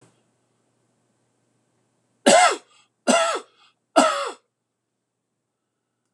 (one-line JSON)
{"three_cough_length": "6.1 s", "three_cough_amplitude": 26028, "three_cough_signal_mean_std_ratio": 0.29, "survey_phase": "beta (2021-08-13 to 2022-03-07)", "age": "65+", "gender": "Male", "wearing_mask": "No", "symptom_none": true, "smoker_status": "Never smoked", "respiratory_condition_asthma": false, "respiratory_condition_other": false, "recruitment_source": "REACT", "submission_delay": "2 days", "covid_test_result": "Negative", "covid_test_method": "RT-qPCR", "influenza_a_test_result": "Negative", "influenza_b_test_result": "Negative"}